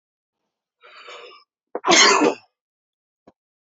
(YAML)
cough_length: 3.7 s
cough_amplitude: 30337
cough_signal_mean_std_ratio: 0.3
survey_phase: beta (2021-08-13 to 2022-03-07)
age: 18-44
gender: Male
wearing_mask: 'No'
symptom_runny_or_blocked_nose: true
symptom_other: true
smoker_status: Ex-smoker
respiratory_condition_asthma: false
respiratory_condition_other: false
recruitment_source: Test and Trace
submission_delay: 1 day
covid_test_result: Positive
covid_test_method: RT-qPCR
covid_ct_value: 29.5
covid_ct_gene: ORF1ab gene